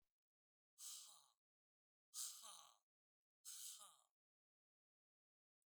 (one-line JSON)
{"exhalation_length": "5.7 s", "exhalation_amplitude": 507, "exhalation_signal_mean_std_ratio": 0.36, "survey_phase": "alpha (2021-03-01 to 2021-08-12)", "age": "65+", "gender": "Male", "wearing_mask": "No", "symptom_none": true, "smoker_status": "Never smoked", "respiratory_condition_asthma": false, "respiratory_condition_other": false, "recruitment_source": "REACT", "submission_delay": "2 days", "covid_test_result": "Negative", "covid_test_method": "RT-qPCR"}